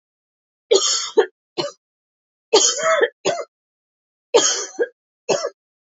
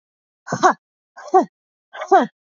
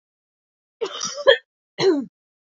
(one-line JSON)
{"three_cough_length": "6.0 s", "three_cough_amplitude": 29215, "three_cough_signal_mean_std_ratio": 0.42, "exhalation_length": "2.6 s", "exhalation_amplitude": 27696, "exhalation_signal_mean_std_ratio": 0.33, "cough_length": "2.6 s", "cough_amplitude": 27964, "cough_signal_mean_std_ratio": 0.34, "survey_phase": "alpha (2021-03-01 to 2021-08-12)", "age": "45-64", "gender": "Female", "wearing_mask": "No", "symptom_cough_any": true, "symptom_fatigue": true, "smoker_status": "Never smoked", "respiratory_condition_asthma": true, "respiratory_condition_other": false, "recruitment_source": "Test and Trace", "submission_delay": "1 day", "covid_test_result": "Positive", "covid_test_method": "RT-qPCR", "covid_ct_value": 14.1, "covid_ct_gene": "N gene", "covid_ct_mean": 14.7, "covid_viral_load": "15000000 copies/ml", "covid_viral_load_category": "High viral load (>1M copies/ml)"}